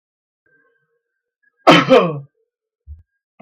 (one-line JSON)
{"cough_length": "3.4 s", "cough_amplitude": 32768, "cough_signal_mean_std_ratio": 0.28, "survey_phase": "beta (2021-08-13 to 2022-03-07)", "age": "45-64", "gender": "Male", "wearing_mask": "No", "symptom_none": true, "smoker_status": "Ex-smoker", "respiratory_condition_asthma": false, "respiratory_condition_other": false, "recruitment_source": "REACT", "submission_delay": "4 days", "covid_test_result": "Negative", "covid_test_method": "RT-qPCR"}